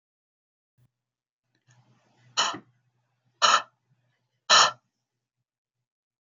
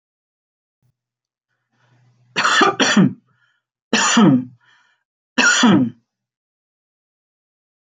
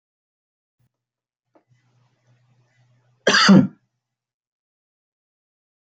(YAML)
exhalation_length: 6.2 s
exhalation_amplitude: 21108
exhalation_signal_mean_std_ratio: 0.23
three_cough_length: 7.9 s
three_cough_amplitude: 26102
three_cough_signal_mean_std_ratio: 0.39
cough_length: 6.0 s
cough_amplitude: 25531
cough_signal_mean_std_ratio: 0.21
survey_phase: beta (2021-08-13 to 2022-03-07)
age: 45-64
gender: Male
wearing_mask: 'No'
symptom_none: true
symptom_onset: 3 days
smoker_status: Never smoked
respiratory_condition_asthma: false
respiratory_condition_other: false
recruitment_source: REACT
submission_delay: 3 days
covid_test_result: Negative
covid_test_method: RT-qPCR
influenza_a_test_result: Negative
influenza_b_test_result: Negative